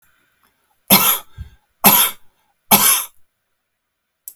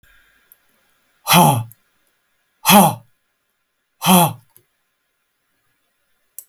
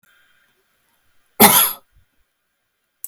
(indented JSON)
{
  "three_cough_length": "4.4 s",
  "three_cough_amplitude": 32768,
  "three_cough_signal_mean_std_ratio": 0.36,
  "exhalation_length": "6.5 s",
  "exhalation_amplitude": 32768,
  "exhalation_signal_mean_std_ratio": 0.3,
  "cough_length": "3.1 s",
  "cough_amplitude": 32768,
  "cough_signal_mean_std_ratio": 0.25,
  "survey_phase": "beta (2021-08-13 to 2022-03-07)",
  "age": "65+",
  "gender": "Male",
  "wearing_mask": "No",
  "symptom_none": true,
  "smoker_status": "Ex-smoker",
  "respiratory_condition_asthma": false,
  "respiratory_condition_other": false,
  "recruitment_source": "REACT",
  "submission_delay": "2 days",
  "covid_test_result": "Negative",
  "covid_test_method": "RT-qPCR"
}